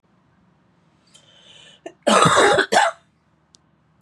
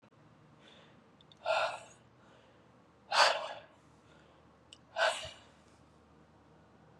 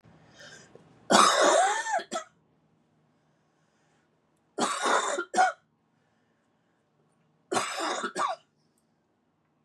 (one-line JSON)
{"cough_length": "4.0 s", "cough_amplitude": 30436, "cough_signal_mean_std_ratio": 0.38, "exhalation_length": "7.0 s", "exhalation_amplitude": 9165, "exhalation_signal_mean_std_ratio": 0.32, "three_cough_length": "9.6 s", "three_cough_amplitude": 20536, "three_cough_signal_mean_std_ratio": 0.39, "survey_phase": "beta (2021-08-13 to 2022-03-07)", "age": "18-44", "gender": "Female", "wearing_mask": "No", "symptom_cough_any": true, "symptom_runny_or_blocked_nose": true, "symptom_sore_throat": true, "symptom_fatigue": true, "symptom_headache": true, "symptom_change_to_sense_of_smell_or_taste": true, "smoker_status": "Ex-smoker", "respiratory_condition_asthma": false, "respiratory_condition_other": false, "recruitment_source": "Test and Trace", "submission_delay": "2 days", "covid_test_result": "Positive", "covid_test_method": "RT-qPCR", "covid_ct_value": 16.1, "covid_ct_gene": "ORF1ab gene", "covid_ct_mean": 16.6, "covid_viral_load": "3500000 copies/ml", "covid_viral_load_category": "High viral load (>1M copies/ml)"}